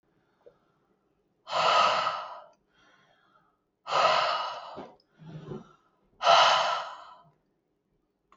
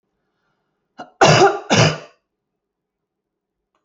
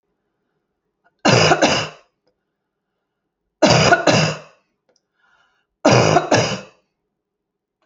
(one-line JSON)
{"exhalation_length": "8.4 s", "exhalation_amplitude": 14688, "exhalation_signal_mean_std_ratio": 0.41, "cough_length": "3.8 s", "cough_amplitude": 28986, "cough_signal_mean_std_ratio": 0.32, "three_cough_length": "7.9 s", "three_cough_amplitude": 32767, "three_cough_signal_mean_std_ratio": 0.4, "survey_phase": "alpha (2021-03-01 to 2021-08-12)", "age": "65+", "gender": "Female", "wearing_mask": "No", "symptom_none": true, "smoker_status": "Never smoked", "respiratory_condition_asthma": false, "respiratory_condition_other": false, "recruitment_source": "REACT", "submission_delay": "1 day", "covid_test_result": "Negative", "covid_test_method": "RT-qPCR"}